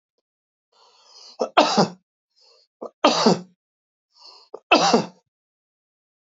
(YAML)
three_cough_length: 6.2 s
three_cough_amplitude: 27877
three_cough_signal_mean_std_ratio: 0.31
survey_phase: beta (2021-08-13 to 2022-03-07)
age: 65+
gender: Male
wearing_mask: 'No'
symptom_none: true
smoker_status: Never smoked
respiratory_condition_asthma: false
respiratory_condition_other: false
recruitment_source: REACT
submission_delay: 3 days
covid_test_result: Negative
covid_test_method: RT-qPCR
influenza_a_test_result: Negative
influenza_b_test_result: Negative